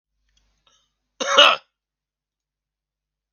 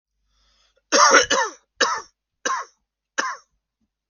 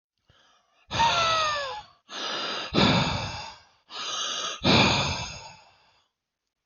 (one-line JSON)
{"cough_length": "3.3 s", "cough_amplitude": 32768, "cough_signal_mean_std_ratio": 0.22, "three_cough_length": "4.1 s", "three_cough_amplitude": 32768, "three_cough_signal_mean_std_ratio": 0.37, "exhalation_length": "6.7 s", "exhalation_amplitude": 15299, "exhalation_signal_mean_std_ratio": 0.57, "survey_phase": "beta (2021-08-13 to 2022-03-07)", "age": "18-44", "gender": "Male", "wearing_mask": "No", "symptom_none": true, "smoker_status": "Never smoked", "respiratory_condition_asthma": false, "respiratory_condition_other": false, "recruitment_source": "REACT", "submission_delay": "2 days", "covid_test_result": "Negative", "covid_test_method": "RT-qPCR"}